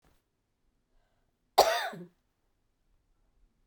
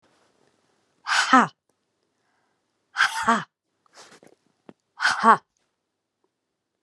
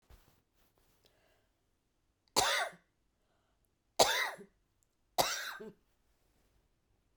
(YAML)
cough_length: 3.7 s
cough_amplitude: 17798
cough_signal_mean_std_ratio: 0.21
exhalation_length: 6.8 s
exhalation_amplitude: 29306
exhalation_signal_mean_std_ratio: 0.27
three_cough_length: 7.2 s
three_cough_amplitude: 9839
three_cough_signal_mean_std_ratio: 0.27
survey_phase: beta (2021-08-13 to 2022-03-07)
age: 65+
gender: Female
wearing_mask: 'No'
symptom_cough_any: true
symptom_runny_or_blocked_nose: true
symptom_fatigue: true
symptom_headache: true
symptom_onset: 4 days
smoker_status: Never smoked
respiratory_condition_asthma: false
respiratory_condition_other: false
recruitment_source: Test and Trace
submission_delay: 2 days
covid_test_result: Positive
covid_test_method: RT-qPCR
covid_ct_value: 17.5
covid_ct_gene: ORF1ab gene